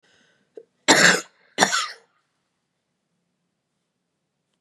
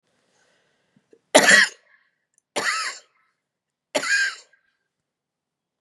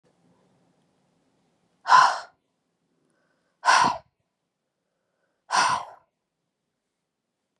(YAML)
cough_length: 4.6 s
cough_amplitude: 30699
cough_signal_mean_std_ratio: 0.26
three_cough_length: 5.8 s
three_cough_amplitude: 32759
three_cough_signal_mean_std_ratio: 0.29
exhalation_length: 7.6 s
exhalation_amplitude: 21126
exhalation_signal_mean_std_ratio: 0.26
survey_phase: beta (2021-08-13 to 2022-03-07)
age: 45-64
gender: Female
wearing_mask: 'No'
symptom_runny_or_blocked_nose: true
smoker_status: Never smoked
respiratory_condition_asthma: true
respiratory_condition_other: false
recruitment_source: REACT
submission_delay: 1 day
covid_test_result: Negative
covid_test_method: RT-qPCR
influenza_a_test_result: Negative
influenza_b_test_result: Negative